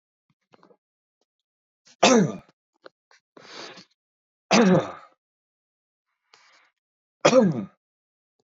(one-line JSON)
{"three_cough_length": "8.4 s", "three_cough_amplitude": 23031, "three_cough_signal_mean_std_ratio": 0.28, "survey_phase": "beta (2021-08-13 to 2022-03-07)", "age": "18-44", "gender": "Male", "wearing_mask": "No", "symptom_none": true, "smoker_status": "Ex-smoker", "respiratory_condition_asthma": false, "respiratory_condition_other": false, "recruitment_source": "REACT", "submission_delay": "4 days", "covid_test_result": "Negative", "covid_test_method": "RT-qPCR", "influenza_a_test_result": "Negative", "influenza_b_test_result": "Negative"}